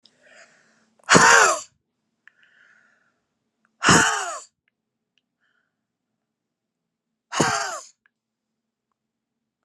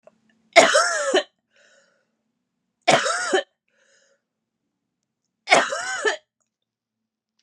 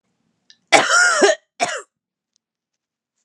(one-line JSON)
{"exhalation_length": "9.6 s", "exhalation_amplitude": 32737, "exhalation_signal_mean_std_ratio": 0.27, "three_cough_length": "7.4 s", "three_cough_amplitude": 32767, "three_cough_signal_mean_std_ratio": 0.34, "cough_length": "3.2 s", "cough_amplitude": 32768, "cough_signal_mean_std_ratio": 0.38, "survey_phase": "alpha (2021-03-01 to 2021-08-12)", "age": "45-64", "gender": "Female", "wearing_mask": "No", "symptom_cough_any": true, "symptom_fatigue": true, "symptom_headache": true, "symptom_change_to_sense_of_smell_or_taste": true, "smoker_status": "Never smoked", "respiratory_condition_asthma": true, "respiratory_condition_other": false, "recruitment_source": "Test and Trace", "submission_delay": "1 day", "covid_test_result": "Positive", "covid_test_method": "LFT"}